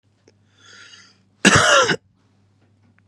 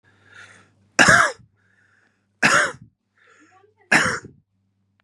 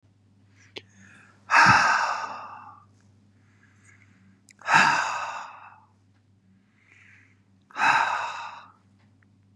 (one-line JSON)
{"cough_length": "3.1 s", "cough_amplitude": 32767, "cough_signal_mean_std_ratio": 0.33, "three_cough_length": "5.0 s", "three_cough_amplitude": 32764, "three_cough_signal_mean_std_ratio": 0.33, "exhalation_length": "9.6 s", "exhalation_amplitude": 23079, "exhalation_signal_mean_std_ratio": 0.37, "survey_phase": "beta (2021-08-13 to 2022-03-07)", "age": "45-64", "gender": "Male", "wearing_mask": "No", "symptom_cough_any": true, "symptom_runny_or_blocked_nose": true, "symptom_headache": true, "symptom_change_to_sense_of_smell_or_taste": true, "symptom_onset": "4 days", "smoker_status": "Current smoker (e-cigarettes or vapes only)", "respiratory_condition_asthma": false, "respiratory_condition_other": false, "recruitment_source": "Test and Trace", "submission_delay": "2 days", "covid_test_result": "Positive", "covid_test_method": "RT-qPCR", "covid_ct_value": 16.6, "covid_ct_gene": "ORF1ab gene", "covid_ct_mean": 16.8, "covid_viral_load": "3200000 copies/ml", "covid_viral_load_category": "High viral load (>1M copies/ml)"}